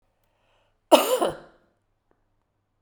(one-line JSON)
{"cough_length": "2.8 s", "cough_amplitude": 32767, "cough_signal_mean_std_ratio": 0.25, "survey_phase": "beta (2021-08-13 to 2022-03-07)", "age": "45-64", "gender": "Female", "wearing_mask": "No", "symptom_cough_any": true, "symptom_shortness_of_breath": true, "symptom_fever_high_temperature": true, "symptom_change_to_sense_of_smell_or_taste": true, "symptom_onset": "4 days", "smoker_status": "Never smoked", "respiratory_condition_asthma": true, "respiratory_condition_other": false, "recruitment_source": "Test and Trace", "submission_delay": "1 day", "covid_test_result": "Positive", "covid_test_method": "RT-qPCR", "covid_ct_value": 14.8, "covid_ct_gene": "ORF1ab gene", "covid_ct_mean": 15.6, "covid_viral_load": "7800000 copies/ml", "covid_viral_load_category": "High viral load (>1M copies/ml)"}